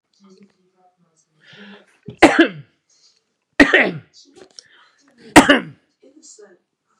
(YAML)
three_cough_length: 7.0 s
three_cough_amplitude: 32768
three_cough_signal_mean_std_ratio: 0.25
survey_phase: beta (2021-08-13 to 2022-03-07)
age: 45-64
gender: Male
wearing_mask: 'No'
symptom_none: true
smoker_status: Never smoked
respiratory_condition_asthma: false
respiratory_condition_other: false
recruitment_source: REACT
submission_delay: 1 day
covid_test_result: Negative
covid_test_method: RT-qPCR
influenza_a_test_result: Negative
influenza_b_test_result: Negative